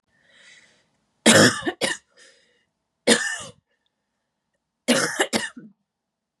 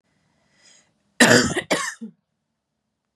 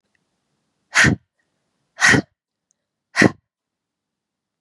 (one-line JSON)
{"three_cough_length": "6.4 s", "three_cough_amplitude": 28343, "three_cough_signal_mean_std_ratio": 0.32, "cough_length": "3.2 s", "cough_amplitude": 32077, "cough_signal_mean_std_ratio": 0.31, "exhalation_length": "4.6 s", "exhalation_amplitude": 32768, "exhalation_signal_mean_std_ratio": 0.26, "survey_phase": "beta (2021-08-13 to 2022-03-07)", "age": "18-44", "gender": "Female", "wearing_mask": "No", "symptom_cough_any": true, "symptom_runny_or_blocked_nose": true, "symptom_shortness_of_breath": true, "symptom_sore_throat": true, "symptom_abdominal_pain": true, "symptom_fatigue": true, "symptom_headache": true, "symptom_onset": "3 days", "smoker_status": "Current smoker (e-cigarettes or vapes only)", "respiratory_condition_asthma": true, "respiratory_condition_other": false, "recruitment_source": "Test and Trace", "submission_delay": "1 day", "covid_test_result": "Positive", "covid_test_method": "LAMP"}